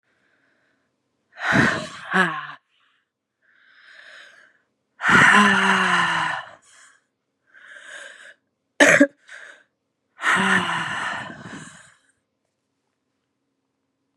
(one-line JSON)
{"exhalation_length": "14.2 s", "exhalation_amplitude": 31493, "exhalation_signal_mean_std_ratio": 0.38, "survey_phase": "beta (2021-08-13 to 2022-03-07)", "age": "45-64", "gender": "Female", "wearing_mask": "No", "symptom_cough_any": true, "symptom_new_continuous_cough": true, "symptom_runny_or_blocked_nose": true, "symptom_sore_throat": true, "symptom_fatigue": true, "symptom_headache": true, "symptom_onset": "3 days", "smoker_status": "Ex-smoker", "respiratory_condition_asthma": false, "respiratory_condition_other": false, "recruitment_source": "Test and Trace", "submission_delay": "2 days", "covid_test_result": "Negative", "covid_test_method": "RT-qPCR"}